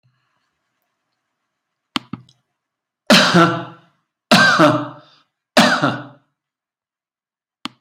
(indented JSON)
{
  "three_cough_length": "7.8 s",
  "three_cough_amplitude": 32768,
  "three_cough_signal_mean_std_ratio": 0.34,
  "survey_phase": "beta (2021-08-13 to 2022-03-07)",
  "age": "65+",
  "gender": "Male",
  "wearing_mask": "No",
  "symptom_none": true,
  "smoker_status": "Never smoked",
  "respiratory_condition_asthma": false,
  "respiratory_condition_other": false,
  "recruitment_source": "REACT",
  "submission_delay": "2 days",
  "covid_test_result": "Negative",
  "covid_test_method": "RT-qPCR",
  "influenza_a_test_result": "Negative",
  "influenza_b_test_result": "Negative"
}